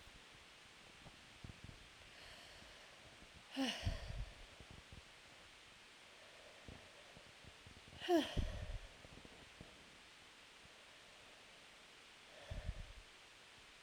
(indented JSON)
{
  "exhalation_length": "13.8 s",
  "exhalation_amplitude": 2300,
  "exhalation_signal_mean_std_ratio": 0.46,
  "survey_phase": "alpha (2021-03-01 to 2021-08-12)",
  "age": "18-44",
  "gender": "Female",
  "wearing_mask": "No",
  "symptom_cough_any": true,
  "symptom_onset": "3 days",
  "smoker_status": "Ex-smoker",
  "respiratory_condition_asthma": false,
  "respiratory_condition_other": false,
  "recruitment_source": "Test and Trace",
  "submission_delay": "2 days",
  "covid_test_result": "Positive",
  "covid_test_method": "RT-qPCR",
  "covid_ct_value": 22.6,
  "covid_ct_gene": "ORF1ab gene",
  "covid_ct_mean": 22.9,
  "covid_viral_load": "31000 copies/ml",
  "covid_viral_load_category": "Low viral load (10K-1M copies/ml)"
}